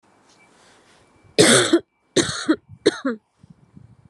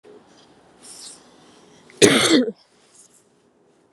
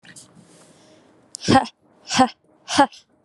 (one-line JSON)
{"three_cough_length": "4.1 s", "three_cough_amplitude": 30451, "three_cough_signal_mean_std_ratio": 0.36, "cough_length": "3.9 s", "cough_amplitude": 32767, "cough_signal_mean_std_ratio": 0.3, "exhalation_length": "3.2 s", "exhalation_amplitude": 29482, "exhalation_signal_mean_std_ratio": 0.32, "survey_phase": "beta (2021-08-13 to 2022-03-07)", "age": "18-44", "gender": "Female", "wearing_mask": "No", "symptom_runny_or_blocked_nose": true, "smoker_status": "Never smoked", "respiratory_condition_asthma": false, "respiratory_condition_other": false, "recruitment_source": "REACT", "submission_delay": "2 days", "covid_test_result": "Negative", "covid_test_method": "RT-qPCR", "influenza_a_test_result": "Negative", "influenza_b_test_result": "Negative"}